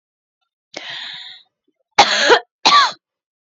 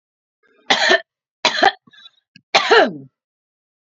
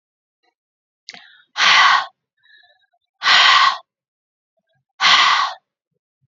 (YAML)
cough_length: 3.6 s
cough_amplitude: 31823
cough_signal_mean_std_ratio: 0.37
three_cough_length: 3.9 s
three_cough_amplitude: 32767
three_cough_signal_mean_std_ratio: 0.36
exhalation_length: 6.3 s
exhalation_amplitude: 30844
exhalation_signal_mean_std_ratio: 0.41
survey_phase: beta (2021-08-13 to 2022-03-07)
age: 45-64
gender: Female
wearing_mask: 'No'
symptom_none: true
smoker_status: Never smoked
respiratory_condition_asthma: false
respiratory_condition_other: false
recruitment_source: Test and Trace
submission_delay: 2 days
covid_test_result: Negative
covid_test_method: RT-qPCR